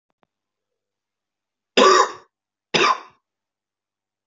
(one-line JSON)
{"cough_length": "4.3 s", "cough_amplitude": 32698, "cough_signal_mean_std_ratio": 0.28, "survey_phase": "beta (2021-08-13 to 2022-03-07)", "age": "18-44", "gender": "Male", "wearing_mask": "No", "symptom_change_to_sense_of_smell_or_taste": true, "smoker_status": "Current smoker (e-cigarettes or vapes only)", "respiratory_condition_asthma": false, "respiratory_condition_other": false, "recruitment_source": "Test and Trace", "submission_delay": "1 day", "covid_test_result": "Positive", "covid_test_method": "RT-qPCR", "covid_ct_value": 20.7, "covid_ct_gene": "ORF1ab gene", "covid_ct_mean": 21.3, "covid_viral_load": "100000 copies/ml", "covid_viral_load_category": "Low viral load (10K-1M copies/ml)"}